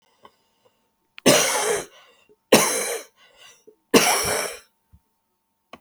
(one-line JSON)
{"three_cough_length": "5.8 s", "three_cough_amplitude": 31605, "three_cough_signal_mean_std_ratio": 0.39, "survey_phase": "beta (2021-08-13 to 2022-03-07)", "age": "65+", "gender": "Female", "wearing_mask": "No", "symptom_cough_any": true, "symptom_shortness_of_breath": true, "symptom_fatigue": true, "smoker_status": "Never smoked", "respiratory_condition_asthma": false, "respiratory_condition_other": true, "recruitment_source": "REACT", "submission_delay": "1 day", "covid_test_result": "Negative", "covid_test_method": "RT-qPCR"}